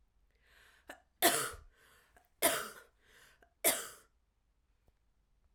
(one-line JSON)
{"three_cough_length": "5.5 s", "three_cough_amplitude": 7936, "three_cough_signal_mean_std_ratio": 0.28, "survey_phase": "alpha (2021-03-01 to 2021-08-12)", "age": "18-44", "gender": "Female", "wearing_mask": "No", "symptom_diarrhoea": true, "symptom_fatigue": true, "symptom_headache": true, "symptom_onset": "3 days", "smoker_status": "Never smoked", "respiratory_condition_asthma": false, "respiratory_condition_other": false, "recruitment_source": "Test and Trace", "submission_delay": "1 day", "covid_test_result": "Positive", "covid_test_method": "RT-qPCR", "covid_ct_value": 28.4, "covid_ct_gene": "N gene"}